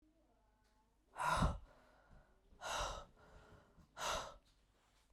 {
  "exhalation_length": "5.1 s",
  "exhalation_amplitude": 2011,
  "exhalation_signal_mean_std_ratio": 0.4,
  "survey_phase": "beta (2021-08-13 to 2022-03-07)",
  "age": "18-44",
  "gender": "Female",
  "wearing_mask": "Yes",
  "symptom_runny_or_blocked_nose": true,
  "symptom_sore_throat": true,
  "symptom_diarrhoea": true,
  "symptom_fever_high_temperature": true,
  "symptom_headache": true,
  "symptom_onset": "2 days",
  "smoker_status": "Current smoker (11 or more cigarettes per day)",
  "respiratory_condition_asthma": false,
  "respiratory_condition_other": false,
  "recruitment_source": "Test and Trace",
  "submission_delay": "2 days",
  "covid_test_result": "Positive",
  "covid_test_method": "ePCR"
}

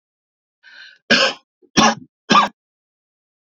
{
  "three_cough_length": "3.4 s",
  "three_cough_amplitude": 30273,
  "three_cough_signal_mean_std_ratio": 0.33,
  "survey_phase": "beta (2021-08-13 to 2022-03-07)",
  "age": "45-64",
  "gender": "Male",
  "wearing_mask": "No",
  "symptom_cough_any": true,
  "symptom_runny_or_blocked_nose": true,
  "symptom_sore_throat": true,
  "symptom_headache": true,
  "symptom_onset": "3 days",
  "smoker_status": "Never smoked",
  "respiratory_condition_asthma": false,
  "respiratory_condition_other": false,
  "recruitment_source": "Test and Trace",
  "submission_delay": "2 days",
  "covid_test_result": "Positive",
  "covid_test_method": "RT-qPCR",
  "covid_ct_value": 24.5,
  "covid_ct_gene": "N gene",
  "covid_ct_mean": 24.6,
  "covid_viral_load": "8500 copies/ml",
  "covid_viral_load_category": "Minimal viral load (< 10K copies/ml)"
}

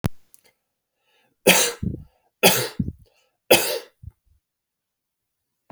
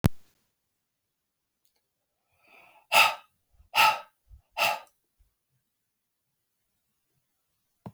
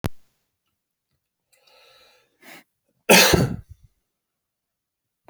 {
  "three_cough_length": "5.7 s",
  "three_cough_amplitude": 32768,
  "three_cough_signal_mean_std_ratio": 0.3,
  "exhalation_length": "7.9 s",
  "exhalation_amplitude": 21255,
  "exhalation_signal_mean_std_ratio": 0.23,
  "cough_length": "5.3 s",
  "cough_amplitude": 32768,
  "cough_signal_mean_std_ratio": 0.23,
  "survey_phase": "beta (2021-08-13 to 2022-03-07)",
  "age": "45-64",
  "gender": "Male",
  "wearing_mask": "No",
  "symptom_none": true,
  "smoker_status": "Never smoked",
  "respiratory_condition_asthma": false,
  "respiratory_condition_other": false,
  "recruitment_source": "REACT",
  "submission_delay": "3 days",
  "covid_test_result": "Negative",
  "covid_test_method": "RT-qPCR"
}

